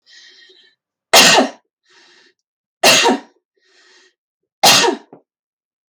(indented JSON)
{
  "three_cough_length": "5.9 s",
  "three_cough_amplitude": 32768,
  "three_cough_signal_mean_std_ratio": 0.35,
  "survey_phase": "beta (2021-08-13 to 2022-03-07)",
  "age": "18-44",
  "gender": "Female",
  "wearing_mask": "No",
  "symptom_none": true,
  "smoker_status": "Never smoked",
  "respiratory_condition_asthma": false,
  "respiratory_condition_other": false,
  "recruitment_source": "REACT",
  "submission_delay": "2 days",
  "covid_test_result": "Negative",
  "covid_test_method": "RT-qPCR"
}